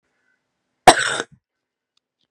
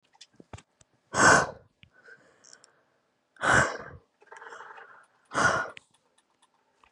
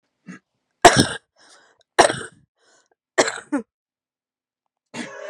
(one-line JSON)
{"cough_length": "2.3 s", "cough_amplitude": 32768, "cough_signal_mean_std_ratio": 0.21, "exhalation_length": "6.9 s", "exhalation_amplitude": 15695, "exhalation_signal_mean_std_ratio": 0.31, "three_cough_length": "5.3 s", "three_cough_amplitude": 32768, "three_cough_signal_mean_std_ratio": 0.24, "survey_phase": "beta (2021-08-13 to 2022-03-07)", "age": "18-44", "gender": "Female", "wearing_mask": "No", "symptom_cough_any": true, "symptom_runny_or_blocked_nose": true, "symptom_shortness_of_breath": true, "symptom_onset": "12 days", "smoker_status": "Current smoker (1 to 10 cigarettes per day)", "respiratory_condition_asthma": false, "respiratory_condition_other": false, "recruitment_source": "REACT", "submission_delay": "1 day", "covid_test_result": "Negative", "covid_test_method": "RT-qPCR", "influenza_a_test_result": "Negative", "influenza_b_test_result": "Negative"}